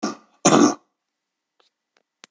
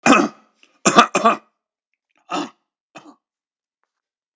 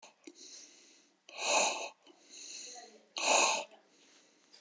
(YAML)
cough_length: 2.3 s
cough_amplitude: 27326
cough_signal_mean_std_ratio: 0.3
three_cough_length: 4.4 s
three_cough_amplitude: 29204
three_cough_signal_mean_std_ratio: 0.3
exhalation_length: 4.6 s
exhalation_amplitude: 6662
exhalation_signal_mean_std_ratio: 0.41
survey_phase: beta (2021-08-13 to 2022-03-07)
age: 65+
gender: Male
wearing_mask: 'No'
symptom_none: true
symptom_onset: 12 days
smoker_status: Ex-smoker
respiratory_condition_asthma: false
respiratory_condition_other: false
recruitment_source: REACT
submission_delay: 4 days
covid_test_result: Negative
covid_test_method: RT-qPCR
influenza_a_test_result: Negative
influenza_b_test_result: Negative